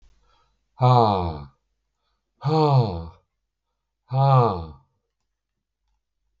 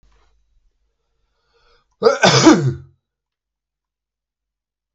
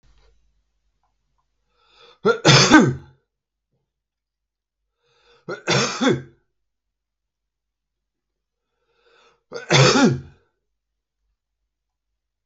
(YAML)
exhalation_length: 6.4 s
exhalation_amplitude: 19632
exhalation_signal_mean_std_ratio: 0.41
cough_length: 4.9 s
cough_amplitude: 32768
cough_signal_mean_std_ratio: 0.28
three_cough_length: 12.5 s
three_cough_amplitude: 32768
three_cough_signal_mean_std_ratio: 0.28
survey_phase: beta (2021-08-13 to 2022-03-07)
age: 45-64
gender: Male
wearing_mask: 'No'
symptom_cough_any: true
symptom_runny_or_blocked_nose: true
symptom_sore_throat: true
symptom_onset: 12 days
smoker_status: Ex-smoker
respiratory_condition_asthma: false
respiratory_condition_other: false
recruitment_source: REACT
submission_delay: 1 day
covid_test_result: Negative
covid_test_method: RT-qPCR